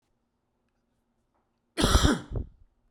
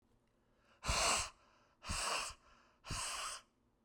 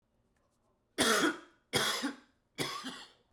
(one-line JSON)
{"cough_length": "2.9 s", "cough_amplitude": 14833, "cough_signal_mean_std_ratio": 0.32, "exhalation_length": "3.8 s", "exhalation_amplitude": 2354, "exhalation_signal_mean_std_ratio": 0.51, "three_cough_length": "3.3 s", "three_cough_amplitude": 9119, "three_cough_signal_mean_std_ratio": 0.45, "survey_phase": "beta (2021-08-13 to 2022-03-07)", "age": "45-64", "gender": "Male", "wearing_mask": "No", "symptom_cough_any": true, "symptom_new_continuous_cough": true, "symptom_runny_or_blocked_nose": true, "symptom_fatigue": true, "symptom_change_to_sense_of_smell_or_taste": true, "symptom_loss_of_taste": true, "symptom_onset": "4 days", "smoker_status": "Never smoked", "respiratory_condition_asthma": false, "respiratory_condition_other": false, "recruitment_source": "Test and Trace", "submission_delay": "2 days", "covid_test_result": "Positive", "covid_test_method": "RT-qPCR", "covid_ct_value": 18.6, "covid_ct_gene": "ORF1ab gene"}